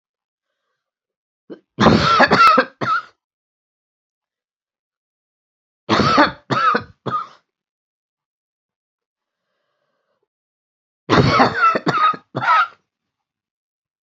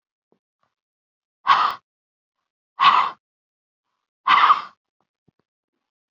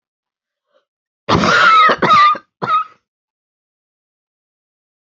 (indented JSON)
{
  "three_cough_length": "14.1 s",
  "three_cough_amplitude": 29726,
  "three_cough_signal_mean_std_ratio": 0.38,
  "exhalation_length": "6.1 s",
  "exhalation_amplitude": 25801,
  "exhalation_signal_mean_std_ratio": 0.3,
  "cough_length": "5.0 s",
  "cough_amplitude": 32768,
  "cough_signal_mean_std_ratio": 0.42,
  "survey_phase": "beta (2021-08-13 to 2022-03-07)",
  "age": "65+",
  "gender": "Female",
  "wearing_mask": "No",
  "symptom_cough_any": true,
  "symptom_runny_or_blocked_nose": true,
  "symptom_loss_of_taste": true,
  "smoker_status": "Never smoked",
  "respiratory_condition_asthma": true,
  "respiratory_condition_other": false,
  "recruitment_source": "Test and Trace",
  "submission_delay": "2 days",
  "covid_test_result": "Positive",
  "covid_test_method": "LFT"
}